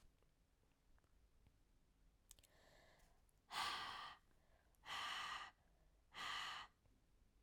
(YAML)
exhalation_length: 7.4 s
exhalation_amplitude: 692
exhalation_signal_mean_std_ratio: 0.48
survey_phase: beta (2021-08-13 to 2022-03-07)
age: 18-44
gender: Female
wearing_mask: 'No'
symptom_cough_any: true
symptom_new_continuous_cough: true
symptom_runny_or_blocked_nose: true
symptom_change_to_sense_of_smell_or_taste: true
symptom_loss_of_taste: true
symptom_onset: 2 days
smoker_status: Never smoked
respiratory_condition_asthma: false
respiratory_condition_other: false
recruitment_source: Test and Trace
submission_delay: 1 day
covid_test_result: Positive
covid_test_method: RT-qPCR